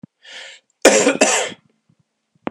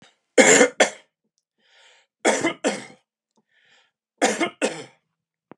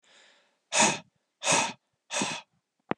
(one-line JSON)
{"cough_length": "2.5 s", "cough_amplitude": 32768, "cough_signal_mean_std_ratio": 0.38, "three_cough_length": "5.6 s", "three_cough_amplitude": 30499, "three_cough_signal_mean_std_ratio": 0.33, "exhalation_length": "3.0 s", "exhalation_amplitude": 13233, "exhalation_signal_mean_std_ratio": 0.4, "survey_phase": "beta (2021-08-13 to 2022-03-07)", "age": "18-44", "gender": "Male", "wearing_mask": "No", "symptom_cough_any": true, "symptom_sore_throat": true, "symptom_fatigue": true, "symptom_headache": true, "smoker_status": "Ex-smoker", "respiratory_condition_asthma": false, "respiratory_condition_other": false, "recruitment_source": "Test and Trace", "submission_delay": "1 day", "covid_test_result": "Positive", "covid_test_method": "ePCR"}